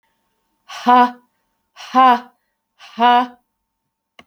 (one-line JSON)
{"exhalation_length": "4.3 s", "exhalation_amplitude": 27814, "exhalation_signal_mean_std_ratio": 0.35, "survey_phase": "beta (2021-08-13 to 2022-03-07)", "age": "65+", "gender": "Female", "wearing_mask": "No", "symptom_cough_any": true, "symptom_shortness_of_breath": true, "symptom_fatigue": true, "smoker_status": "Never smoked", "respiratory_condition_asthma": false, "respiratory_condition_other": true, "recruitment_source": "REACT", "submission_delay": "1 day", "covid_test_result": "Negative", "covid_test_method": "RT-qPCR"}